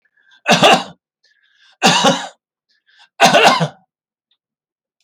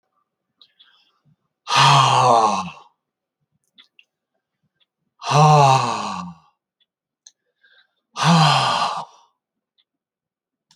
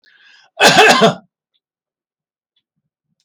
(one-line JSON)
{"three_cough_length": "5.0 s", "three_cough_amplitude": 32767, "three_cough_signal_mean_std_ratio": 0.4, "exhalation_length": "10.8 s", "exhalation_amplitude": 29876, "exhalation_signal_mean_std_ratio": 0.39, "cough_length": "3.2 s", "cough_amplitude": 32768, "cough_signal_mean_std_ratio": 0.34, "survey_phase": "beta (2021-08-13 to 2022-03-07)", "age": "65+", "gender": "Male", "wearing_mask": "No", "symptom_none": true, "smoker_status": "Never smoked", "respiratory_condition_asthma": false, "respiratory_condition_other": false, "recruitment_source": "REACT", "submission_delay": "14 days", "covid_test_result": "Negative", "covid_test_method": "RT-qPCR"}